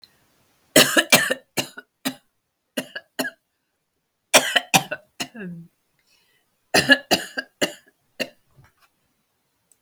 {"three_cough_length": "9.8 s", "three_cough_amplitude": 32768, "three_cough_signal_mean_std_ratio": 0.28, "survey_phase": "beta (2021-08-13 to 2022-03-07)", "age": "45-64", "gender": "Female", "wearing_mask": "No", "symptom_cough_any": true, "symptom_new_continuous_cough": true, "symptom_runny_or_blocked_nose": true, "symptom_shortness_of_breath": true, "symptom_fatigue": true, "symptom_fever_high_temperature": true, "symptom_change_to_sense_of_smell_or_taste": true, "symptom_loss_of_taste": true, "symptom_onset": "8 days", "smoker_status": "Ex-smoker", "respiratory_condition_asthma": false, "respiratory_condition_other": false, "recruitment_source": "Test and Trace", "submission_delay": "2 days", "covid_test_result": "Positive", "covid_test_method": "RT-qPCR", "covid_ct_value": 24.3, "covid_ct_gene": "ORF1ab gene"}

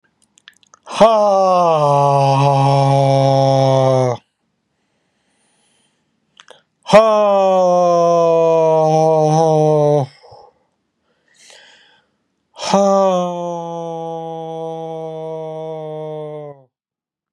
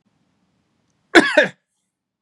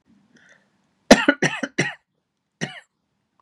{"exhalation_length": "17.3 s", "exhalation_amplitude": 32768, "exhalation_signal_mean_std_ratio": 0.64, "three_cough_length": "2.2 s", "three_cough_amplitude": 32768, "three_cough_signal_mean_std_ratio": 0.26, "cough_length": "3.4 s", "cough_amplitude": 32768, "cough_signal_mean_std_ratio": 0.24, "survey_phase": "beta (2021-08-13 to 2022-03-07)", "age": "45-64", "gender": "Male", "wearing_mask": "No", "symptom_none": true, "smoker_status": "Ex-smoker", "respiratory_condition_asthma": false, "respiratory_condition_other": false, "recruitment_source": "REACT", "submission_delay": "2 days", "covid_test_result": "Negative", "covid_test_method": "RT-qPCR", "influenza_a_test_result": "Negative", "influenza_b_test_result": "Negative"}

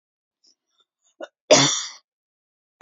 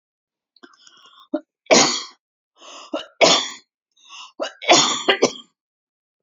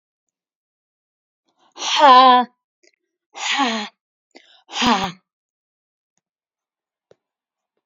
{"cough_length": "2.8 s", "cough_amplitude": 27981, "cough_signal_mean_std_ratio": 0.25, "three_cough_length": "6.2 s", "three_cough_amplitude": 31034, "three_cough_signal_mean_std_ratio": 0.35, "exhalation_length": "7.9 s", "exhalation_amplitude": 28723, "exhalation_signal_mean_std_ratio": 0.3, "survey_phase": "beta (2021-08-13 to 2022-03-07)", "age": "45-64", "gender": "Female", "wearing_mask": "No", "symptom_none": true, "smoker_status": "Never smoked", "respiratory_condition_asthma": false, "respiratory_condition_other": false, "recruitment_source": "REACT", "submission_delay": "0 days", "covid_test_result": "Negative", "covid_test_method": "RT-qPCR"}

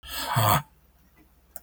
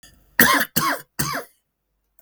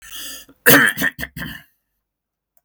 {"exhalation_length": "1.6 s", "exhalation_amplitude": 17346, "exhalation_signal_mean_std_ratio": 0.45, "three_cough_length": "2.2 s", "three_cough_amplitude": 32768, "three_cough_signal_mean_std_ratio": 0.42, "cough_length": "2.6 s", "cough_amplitude": 32768, "cough_signal_mean_std_ratio": 0.35, "survey_phase": "beta (2021-08-13 to 2022-03-07)", "age": "45-64", "gender": "Male", "wearing_mask": "No", "symptom_none": true, "smoker_status": "Never smoked", "respiratory_condition_asthma": false, "respiratory_condition_other": false, "recruitment_source": "REACT", "submission_delay": "2 days", "covid_test_result": "Negative", "covid_test_method": "RT-qPCR", "influenza_a_test_result": "Negative", "influenza_b_test_result": "Negative"}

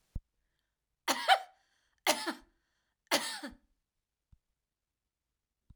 {"three_cough_length": "5.8 s", "three_cough_amplitude": 8127, "three_cough_signal_mean_std_ratio": 0.26, "survey_phase": "alpha (2021-03-01 to 2021-08-12)", "age": "45-64", "gender": "Female", "wearing_mask": "No", "symptom_fatigue": true, "symptom_headache": true, "symptom_onset": "12 days", "smoker_status": "Never smoked", "respiratory_condition_asthma": false, "respiratory_condition_other": false, "recruitment_source": "REACT", "submission_delay": "3 days", "covid_test_result": "Negative", "covid_test_method": "RT-qPCR"}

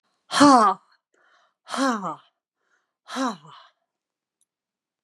{"exhalation_length": "5.0 s", "exhalation_amplitude": 26865, "exhalation_signal_mean_std_ratio": 0.31, "survey_phase": "beta (2021-08-13 to 2022-03-07)", "age": "65+", "gender": "Female", "wearing_mask": "No", "symptom_none": true, "smoker_status": "Never smoked", "respiratory_condition_asthma": true, "respiratory_condition_other": false, "recruitment_source": "REACT", "submission_delay": "3 days", "covid_test_result": "Negative", "covid_test_method": "RT-qPCR"}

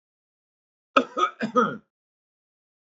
{"cough_length": "2.8 s", "cough_amplitude": 23388, "cough_signal_mean_std_ratio": 0.3, "survey_phase": "beta (2021-08-13 to 2022-03-07)", "age": "45-64", "gender": "Male", "wearing_mask": "No", "symptom_none": true, "smoker_status": "Ex-smoker", "respiratory_condition_asthma": false, "respiratory_condition_other": false, "recruitment_source": "REACT", "submission_delay": "2 days", "covid_test_result": "Negative", "covid_test_method": "RT-qPCR", "influenza_a_test_result": "Unknown/Void", "influenza_b_test_result": "Unknown/Void"}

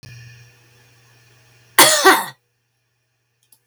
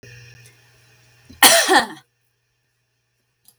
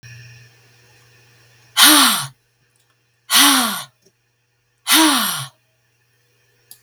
{"cough_length": "3.7 s", "cough_amplitude": 32768, "cough_signal_mean_std_ratio": 0.29, "three_cough_length": "3.6 s", "three_cough_amplitude": 32768, "three_cough_signal_mean_std_ratio": 0.28, "exhalation_length": "6.8 s", "exhalation_amplitude": 32768, "exhalation_signal_mean_std_ratio": 0.37, "survey_phase": "beta (2021-08-13 to 2022-03-07)", "age": "65+", "gender": "Female", "wearing_mask": "No", "symptom_none": true, "smoker_status": "Never smoked", "respiratory_condition_asthma": false, "respiratory_condition_other": false, "recruitment_source": "REACT", "submission_delay": "2 days", "covid_test_result": "Negative", "covid_test_method": "RT-qPCR", "influenza_a_test_result": "Negative", "influenza_b_test_result": "Negative"}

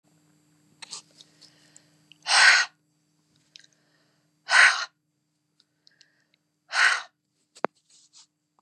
{"exhalation_length": "8.6 s", "exhalation_amplitude": 23255, "exhalation_signal_mean_std_ratio": 0.26, "survey_phase": "beta (2021-08-13 to 2022-03-07)", "age": "45-64", "gender": "Female", "wearing_mask": "No", "symptom_none": true, "symptom_onset": "3 days", "smoker_status": "Never smoked", "respiratory_condition_asthma": false, "respiratory_condition_other": false, "recruitment_source": "Test and Trace", "submission_delay": "2 days", "covid_test_result": "Positive", "covid_test_method": "RT-qPCR", "covid_ct_value": 20.3, "covid_ct_gene": "ORF1ab gene", "covid_ct_mean": 20.6, "covid_viral_load": "170000 copies/ml", "covid_viral_load_category": "Low viral load (10K-1M copies/ml)"}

